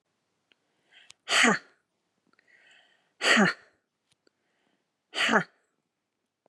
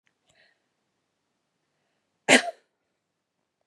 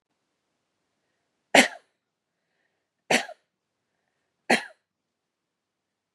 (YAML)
exhalation_length: 6.5 s
exhalation_amplitude: 14727
exhalation_signal_mean_std_ratio: 0.29
cough_length: 3.7 s
cough_amplitude: 23427
cough_signal_mean_std_ratio: 0.15
three_cough_length: 6.1 s
three_cough_amplitude: 29623
three_cough_signal_mean_std_ratio: 0.17
survey_phase: beta (2021-08-13 to 2022-03-07)
age: 45-64
gender: Female
wearing_mask: 'No'
symptom_abdominal_pain: true
symptom_fatigue: true
symptom_other: true
symptom_onset: 8 days
smoker_status: Never smoked
respiratory_condition_asthma: false
respiratory_condition_other: false
recruitment_source: REACT
submission_delay: 2 days
covid_test_result: Negative
covid_test_method: RT-qPCR
influenza_a_test_result: Negative
influenza_b_test_result: Negative